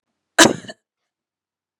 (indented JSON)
{
  "cough_length": "1.8 s",
  "cough_amplitude": 32768,
  "cough_signal_mean_std_ratio": 0.21,
  "survey_phase": "beta (2021-08-13 to 2022-03-07)",
  "age": "45-64",
  "gender": "Female",
  "wearing_mask": "No",
  "symptom_cough_any": true,
  "symptom_runny_or_blocked_nose": true,
  "symptom_abdominal_pain": true,
  "symptom_headache": true,
  "symptom_other": true,
  "symptom_onset": "5 days",
  "smoker_status": "Never smoked",
  "respiratory_condition_asthma": false,
  "respiratory_condition_other": false,
  "recruitment_source": "Test and Trace",
  "submission_delay": "1 day",
  "covid_test_result": "Positive",
  "covid_test_method": "RT-qPCR",
  "covid_ct_value": 27.3,
  "covid_ct_gene": "ORF1ab gene"
}